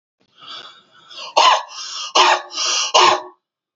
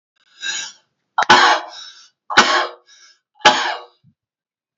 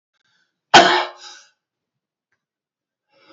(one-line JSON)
{"exhalation_length": "3.8 s", "exhalation_amplitude": 32442, "exhalation_signal_mean_std_ratio": 0.49, "three_cough_length": "4.8 s", "three_cough_amplitude": 31312, "three_cough_signal_mean_std_ratio": 0.38, "cough_length": "3.3 s", "cough_amplitude": 32739, "cough_signal_mean_std_ratio": 0.23, "survey_phase": "beta (2021-08-13 to 2022-03-07)", "age": "45-64", "gender": "Male", "wearing_mask": "No", "symptom_other": true, "smoker_status": "Ex-smoker", "respiratory_condition_asthma": false, "respiratory_condition_other": false, "recruitment_source": "Test and Trace", "submission_delay": "-1 day", "covid_test_result": "Negative", "covid_test_method": "LFT"}